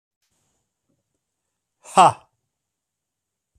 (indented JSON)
{
  "exhalation_length": "3.6 s",
  "exhalation_amplitude": 27154,
  "exhalation_signal_mean_std_ratio": 0.17,
  "survey_phase": "alpha (2021-03-01 to 2021-08-12)",
  "age": "45-64",
  "gender": "Male",
  "wearing_mask": "No",
  "symptom_none": true,
  "smoker_status": "Never smoked",
  "respiratory_condition_asthma": false,
  "respiratory_condition_other": false,
  "recruitment_source": "REACT",
  "submission_delay": "1 day",
  "covid_test_result": "Negative",
  "covid_test_method": "RT-qPCR"
}